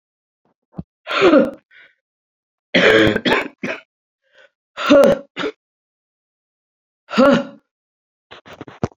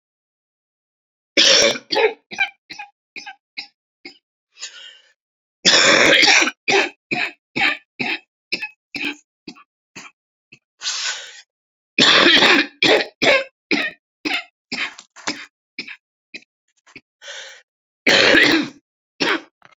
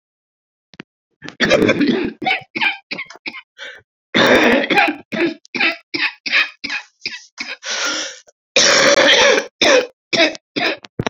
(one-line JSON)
{"exhalation_length": "9.0 s", "exhalation_amplitude": 30477, "exhalation_signal_mean_std_ratio": 0.37, "three_cough_length": "19.8 s", "three_cough_amplitude": 32768, "three_cough_signal_mean_std_ratio": 0.42, "cough_length": "11.1 s", "cough_amplitude": 32768, "cough_signal_mean_std_ratio": 0.56, "survey_phase": "beta (2021-08-13 to 2022-03-07)", "age": "45-64", "gender": "Female", "wearing_mask": "No", "symptom_cough_any": true, "symptom_new_continuous_cough": true, "symptom_runny_or_blocked_nose": true, "symptom_shortness_of_breath": true, "symptom_sore_throat": true, "symptom_diarrhoea": true, "symptom_fatigue": true, "symptom_headache": true, "symptom_other": true, "symptom_onset": "3 days", "smoker_status": "Never smoked", "respiratory_condition_asthma": false, "respiratory_condition_other": false, "recruitment_source": "Test and Trace", "submission_delay": "2 days", "covid_test_result": "Positive", "covid_test_method": "RT-qPCR", "covid_ct_value": 15.7, "covid_ct_gene": "ORF1ab gene", "covid_ct_mean": 16.1, "covid_viral_load": "5300000 copies/ml", "covid_viral_load_category": "High viral load (>1M copies/ml)"}